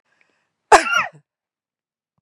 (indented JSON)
{
  "cough_length": "2.2 s",
  "cough_amplitude": 32768,
  "cough_signal_mean_std_ratio": 0.25,
  "survey_phase": "beta (2021-08-13 to 2022-03-07)",
  "age": "45-64",
  "gender": "Female",
  "wearing_mask": "No",
  "symptom_none": true,
  "smoker_status": "Never smoked",
  "respiratory_condition_asthma": false,
  "respiratory_condition_other": false,
  "recruitment_source": "REACT",
  "submission_delay": "1 day",
  "covid_test_result": "Negative",
  "covid_test_method": "RT-qPCR",
  "influenza_a_test_result": "Negative",
  "influenza_b_test_result": "Negative"
}